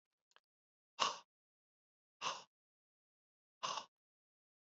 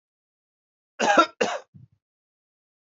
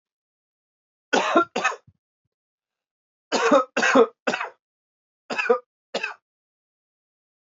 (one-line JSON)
{"exhalation_length": "4.8 s", "exhalation_amplitude": 3986, "exhalation_signal_mean_std_ratio": 0.23, "cough_length": "2.8 s", "cough_amplitude": 18611, "cough_signal_mean_std_ratio": 0.28, "three_cough_length": "7.5 s", "three_cough_amplitude": 19421, "three_cough_signal_mean_std_ratio": 0.34, "survey_phase": "beta (2021-08-13 to 2022-03-07)", "age": "18-44", "gender": "Male", "wearing_mask": "No", "symptom_cough_any": true, "symptom_runny_or_blocked_nose": true, "symptom_shortness_of_breath": true, "symptom_fever_high_temperature": true, "symptom_onset": "5 days", "smoker_status": "Never smoked", "respiratory_condition_asthma": true, "respiratory_condition_other": false, "recruitment_source": "Test and Trace", "submission_delay": "1 day", "covid_test_result": "Positive", "covid_test_method": "RT-qPCR", "covid_ct_value": 16.4, "covid_ct_gene": "ORF1ab gene", "covid_ct_mean": 16.7, "covid_viral_load": "3200000 copies/ml", "covid_viral_load_category": "High viral load (>1M copies/ml)"}